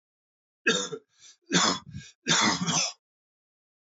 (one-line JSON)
{"three_cough_length": "3.9 s", "three_cough_amplitude": 11024, "three_cough_signal_mean_std_ratio": 0.45, "survey_phase": "alpha (2021-03-01 to 2021-08-12)", "age": "45-64", "gender": "Male", "wearing_mask": "No", "symptom_cough_any": true, "symptom_shortness_of_breath": true, "symptom_abdominal_pain": true, "symptom_loss_of_taste": true, "symptom_onset": "4 days", "smoker_status": "Never smoked", "respiratory_condition_asthma": false, "respiratory_condition_other": false, "recruitment_source": "Test and Trace", "submission_delay": "2 days", "covid_test_result": "Positive", "covid_test_method": "RT-qPCR", "covid_ct_value": 13.1, "covid_ct_gene": "ORF1ab gene", "covid_ct_mean": 13.3, "covid_viral_load": "44000000 copies/ml", "covid_viral_load_category": "High viral load (>1M copies/ml)"}